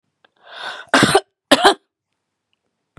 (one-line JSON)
{"cough_length": "3.0 s", "cough_amplitude": 32767, "cough_signal_mean_std_ratio": 0.32, "survey_phase": "beta (2021-08-13 to 2022-03-07)", "age": "65+", "gender": "Female", "wearing_mask": "No", "symptom_cough_any": true, "symptom_sore_throat": true, "smoker_status": "Never smoked", "respiratory_condition_asthma": true, "respiratory_condition_other": false, "recruitment_source": "Test and Trace", "submission_delay": "2 days", "covid_test_result": "Positive", "covid_test_method": "RT-qPCR", "covid_ct_value": 17.2, "covid_ct_gene": "ORF1ab gene", "covid_ct_mean": 17.4, "covid_viral_load": "2000000 copies/ml", "covid_viral_load_category": "High viral load (>1M copies/ml)"}